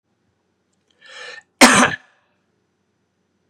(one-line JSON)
{"cough_length": "3.5 s", "cough_amplitude": 32768, "cough_signal_mean_std_ratio": 0.24, "survey_phase": "beta (2021-08-13 to 2022-03-07)", "age": "45-64", "gender": "Male", "wearing_mask": "No", "symptom_cough_any": true, "symptom_runny_or_blocked_nose": true, "symptom_onset": "3 days", "smoker_status": "Never smoked", "respiratory_condition_asthma": false, "respiratory_condition_other": false, "recruitment_source": "Test and Trace", "submission_delay": "2 days", "covid_test_result": "Positive", "covid_test_method": "RT-qPCR", "covid_ct_value": 21.1, "covid_ct_gene": "N gene", "covid_ct_mean": 21.3, "covid_viral_load": "110000 copies/ml", "covid_viral_load_category": "Low viral load (10K-1M copies/ml)"}